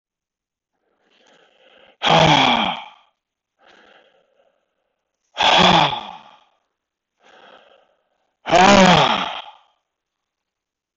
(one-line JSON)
{"exhalation_length": "11.0 s", "exhalation_amplitude": 22299, "exhalation_signal_mean_std_ratio": 0.36, "survey_phase": "beta (2021-08-13 to 2022-03-07)", "age": "65+", "gender": "Male", "wearing_mask": "No", "symptom_runny_or_blocked_nose": true, "symptom_fatigue": true, "symptom_onset": "4 days", "smoker_status": "Never smoked", "respiratory_condition_asthma": false, "respiratory_condition_other": false, "recruitment_source": "REACT", "submission_delay": "0 days", "covid_test_result": "Negative", "covid_test_method": "RT-qPCR", "influenza_a_test_result": "Unknown/Void", "influenza_b_test_result": "Unknown/Void"}